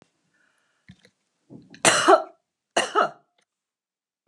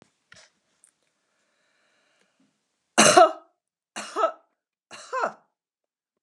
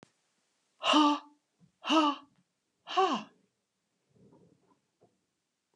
{"cough_length": "4.3 s", "cough_amplitude": 28761, "cough_signal_mean_std_ratio": 0.28, "three_cough_length": "6.2 s", "three_cough_amplitude": 32440, "three_cough_signal_mean_std_ratio": 0.23, "exhalation_length": "5.8 s", "exhalation_amplitude": 7595, "exhalation_signal_mean_std_ratio": 0.32, "survey_phase": "alpha (2021-03-01 to 2021-08-12)", "age": "65+", "gender": "Female", "wearing_mask": "No", "symptom_none": true, "smoker_status": "Never smoked", "respiratory_condition_asthma": false, "respiratory_condition_other": false, "recruitment_source": "REACT", "submission_delay": "1 day", "covid_test_result": "Negative", "covid_test_method": "RT-qPCR"}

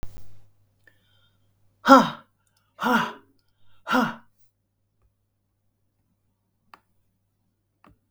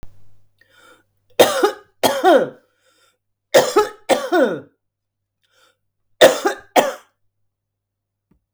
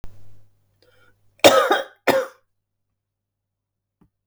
{"exhalation_length": "8.1 s", "exhalation_amplitude": 32766, "exhalation_signal_mean_std_ratio": 0.23, "three_cough_length": "8.5 s", "three_cough_amplitude": 32768, "three_cough_signal_mean_std_ratio": 0.35, "cough_length": "4.3 s", "cough_amplitude": 32768, "cough_signal_mean_std_ratio": 0.29, "survey_phase": "beta (2021-08-13 to 2022-03-07)", "age": "65+", "gender": "Female", "wearing_mask": "No", "symptom_none": true, "smoker_status": "Never smoked", "respiratory_condition_asthma": false, "respiratory_condition_other": false, "recruitment_source": "REACT", "submission_delay": "2 days", "covid_test_result": "Negative", "covid_test_method": "RT-qPCR", "influenza_a_test_result": "Negative", "influenza_b_test_result": "Negative"}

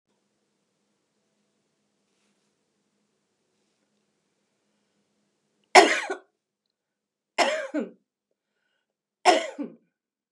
{"three_cough_length": "10.3 s", "three_cough_amplitude": 31249, "three_cough_signal_mean_std_ratio": 0.19, "survey_phase": "beta (2021-08-13 to 2022-03-07)", "age": "65+", "gender": "Female", "wearing_mask": "No", "symptom_none": true, "smoker_status": "Ex-smoker", "respiratory_condition_asthma": false, "respiratory_condition_other": false, "recruitment_source": "REACT", "submission_delay": "2 days", "covid_test_result": "Negative", "covid_test_method": "RT-qPCR", "influenza_a_test_result": "Negative", "influenza_b_test_result": "Negative"}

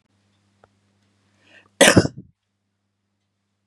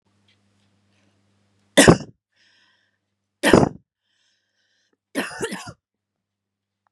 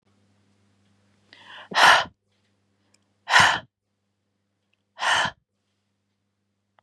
{"cough_length": "3.7 s", "cough_amplitude": 32768, "cough_signal_mean_std_ratio": 0.19, "three_cough_length": "6.9 s", "three_cough_amplitude": 32768, "three_cough_signal_mean_std_ratio": 0.21, "exhalation_length": "6.8 s", "exhalation_amplitude": 29234, "exhalation_signal_mean_std_ratio": 0.27, "survey_phase": "beta (2021-08-13 to 2022-03-07)", "age": "18-44", "gender": "Female", "wearing_mask": "No", "symptom_abdominal_pain": true, "symptom_fatigue": true, "symptom_headache": true, "symptom_other": true, "smoker_status": "Ex-smoker", "respiratory_condition_asthma": false, "respiratory_condition_other": false, "recruitment_source": "REACT", "submission_delay": "2 days", "covid_test_result": "Negative", "covid_test_method": "RT-qPCR", "influenza_a_test_result": "Unknown/Void", "influenza_b_test_result": "Unknown/Void"}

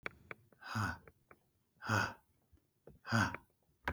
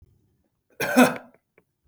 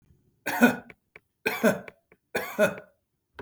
{"exhalation_length": "3.9 s", "exhalation_amplitude": 4154, "exhalation_signal_mean_std_ratio": 0.38, "cough_length": "1.9 s", "cough_amplitude": 20065, "cough_signal_mean_std_ratio": 0.29, "three_cough_length": "3.4 s", "three_cough_amplitude": 16204, "three_cough_signal_mean_std_ratio": 0.37, "survey_phase": "beta (2021-08-13 to 2022-03-07)", "age": "45-64", "gender": "Male", "wearing_mask": "No", "symptom_none": true, "smoker_status": "Never smoked", "respiratory_condition_asthma": false, "respiratory_condition_other": false, "recruitment_source": "REACT", "submission_delay": "1 day", "covid_test_result": "Negative", "covid_test_method": "RT-qPCR", "influenza_a_test_result": "Negative", "influenza_b_test_result": "Negative"}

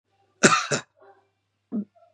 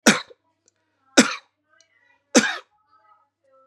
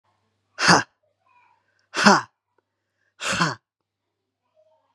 {"cough_length": "2.1 s", "cough_amplitude": 29455, "cough_signal_mean_std_ratio": 0.31, "three_cough_length": "3.7 s", "three_cough_amplitude": 32767, "three_cough_signal_mean_std_ratio": 0.24, "exhalation_length": "4.9 s", "exhalation_amplitude": 32270, "exhalation_signal_mean_std_ratio": 0.27, "survey_phase": "beta (2021-08-13 to 2022-03-07)", "age": "45-64", "gender": "Male", "wearing_mask": "No", "symptom_none": true, "smoker_status": "Never smoked", "recruitment_source": "REACT", "submission_delay": "2 days", "covid_test_result": "Negative", "covid_test_method": "RT-qPCR", "influenza_a_test_result": "Negative", "influenza_b_test_result": "Negative"}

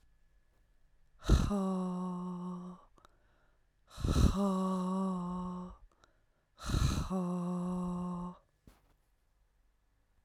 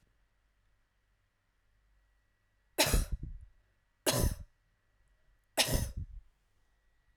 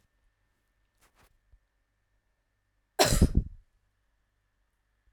{"exhalation_length": "10.2 s", "exhalation_amplitude": 7395, "exhalation_signal_mean_std_ratio": 0.6, "three_cough_length": "7.2 s", "three_cough_amplitude": 7434, "three_cough_signal_mean_std_ratio": 0.32, "cough_length": "5.1 s", "cough_amplitude": 19852, "cough_signal_mean_std_ratio": 0.21, "survey_phase": "alpha (2021-03-01 to 2021-08-12)", "age": "18-44", "gender": "Female", "wearing_mask": "No", "symptom_none": true, "smoker_status": "Never smoked", "respiratory_condition_asthma": false, "respiratory_condition_other": false, "recruitment_source": "REACT", "submission_delay": "2 days", "covid_test_result": "Negative", "covid_test_method": "RT-qPCR"}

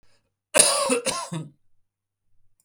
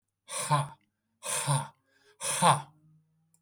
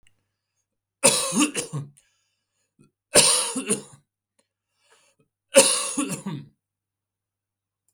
{"cough_length": "2.6 s", "cough_amplitude": 32172, "cough_signal_mean_std_ratio": 0.39, "exhalation_length": "3.4 s", "exhalation_amplitude": 12728, "exhalation_signal_mean_std_ratio": 0.43, "three_cough_length": "7.9 s", "three_cough_amplitude": 32768, "three_cough_signal_mean_std_ratio": 0.34, "survey_phase": "beta (2021-08-13 to 2022-03-07)", "age": "45-64", "gender": "Male", "wearing_mask": "No", "symptom_cough_any": true, "symptom_new_continuous_cough": true, "symptom_shortness_of_breath": true, "symptom_other": true, "symptom_onset": "9 days", "smoker_status": "Never smoked", "respiratory_condition_asthma": false, "respiratory_condition_other": false, "recruitment_source": "Test and Trace", "submission_delay": "2 days", "covid_test_result": "Negative", "covid_test_method": "RT-qPCR"}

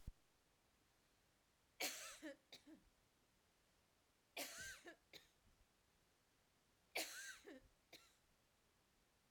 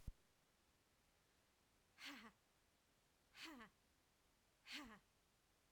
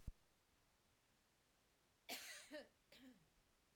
{"three_cough_length": "9.3 s", "three_cough_amplitude": 786, "three_cough_signal_mean_std_ratio": 0.38, "exhalation_length": "5.7 s", "exhalation_amplitude": 397, "exhalation_signal_mean_std_ratio": 0.43, "cough_length": "3.8 s", "cough_amplitude": 436, "cough_signal_mean_std_ratio": 0.42, "survey_phase": "alpha (2021-03-01 to 2021-08-12)", "age": "45-64", "gender": "Female", "wearing_mask": "No", "symptom_fatigue": true, "smoker_status": "Never smoked", "respiratory_condition_asthma": true, "respiratory_condition_other": false, "recruitment_source": "REACT", "submission_delay": "1 day", "covid_test_result": "Negative", "covid_test_method": "RT-qPCR"}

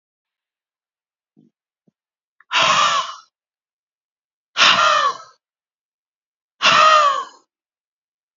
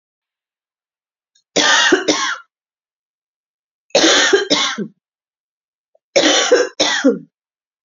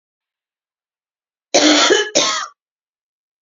{"exhalation_length": "8.4 s", "exhalation_amplitude": 29473, "exhalation_signal_mean_std_ratio": 0.37, "three_cough_length": "7.9 s", "three_cough_amplitude": 32767, "three_cough_signal_mean_std_ratio": 0.45, "cough_length": "3.4 s", "cough_amplitude": 31883, "cough_signal_mean_std_ratio": 0.39, "survey_phase": "beta (2021-08-13 to 2022-03-07)", "age": "45-64", "gender": "Female", "wearing_mask": "No", "symptom_runny_or_blocked_nose": true, "symptom_fever_high_temperature": true, "symptom_headache": true, "symptom_other": true, "symptom_onset": "2 days", "smoker_status": "Ex-smoker", "respiratory_condition_asthma": true, "respiratory_condition_other": false, "recruitment_source": "Test and Trace", "submission_delay": "1 day", "covid_test_result": "Positive", "covid_test_method": "RT-qPCR", "covid_ct_value": 20.2, "covid_ct_gene": "ORF1ab gene"}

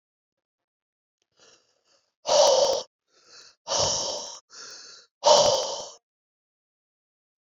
{"exhalation_length": "7.6 s", "exhalation_amplitude": 21501, "exhalation_signal_mean_std_ratio": 0.36, "survey_phase": "beta (2021-08-13 to 2022-03-07)", "age": "45-64", "gender": "Male", "wearing_mask": "No", "symptom_cough_any": true, "symptom_runny_or_blocked_nose": true, "symptom_sore_throat": true, "symptom_abdominal_pain": true, "symptom_fatigue": true, "symptom_fever_high_temperature": true, "symptom_headache": true, "symptom_change_to_sense_of_smell_or_taste": true, "symptom_loss_of_taste": true, "symptom_onset": "2 days", "smoker_status": "Never smoked", "respiratory_condition_asthma": false, "respiratory_condition_other": false, "recruitment_source": "Test and Trace", "submission_delay": "1 day", "covid_test_result": "Positive", "covid_test_method": "RT-qPCR", "covid_ct_value": 23.7, "covid_ct_gene": "ORF1ab gene", "covid_ct_mean": 24.4, "covid_viral_load": "10000 copies/ml", "covid_viral_load_category": "Minimal viral load (< 10K copies/ml)"}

